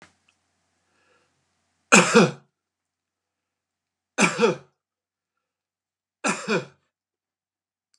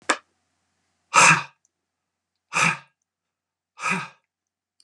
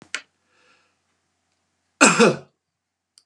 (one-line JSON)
{"three_cough_length": "8.0 s", "three_cough_amplitude": 31878, "three_cough_signal_mean_std_ratio": 0.25, "exhalation_length": "4.8 s", "exhalation_amplitude": 31192, "exhalation_signal_mean_std_ratio": 0.28, "cough_length": "3.3 s", "cough_amplitude": 32767, "cough_signal_mean_std_ratio": 0.25, "survey_phase": "beta (2021-08-13 to 2022-03-07)", "age": "45-64", "gender": "Male", "wearing_mask": "No", "symptom_none": true, "smoker_status": "Never smoked", "respiratory_condition_asthma": false, "respiratory_condition_other": false, "recruitment_source": "REACT", "submission_delay": "1 day", "covid_test_result": "Negative", "covid_test_method": "RT-qPCR", "influenza_a_test_result": "Negative", "influenza_b_test_result": "Negative"}